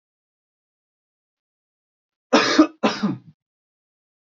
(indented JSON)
{
  "cough_length": "4.4 s",
  "cough_amplitude": 27127,
  "cough_signal_mean_std_ratio": 0.27,
  "survey_phase": "beta (2021-08-13 to 2022-03-07)",
  "age": "18-44",
  "gender": "Male",
  "wearing_mask": "No",
  "symptom_none": true,
  "smoker_status": "Ex-smoker",
  "respiratory_condition_asthma": false,
  "respiratory_condition_other": false,
  "recruitment_source": "REACT",
  "submission_delay": "1 day",
  "covid_test_result": "Negative",
  "covid_test_method": "RT-qPCR"
}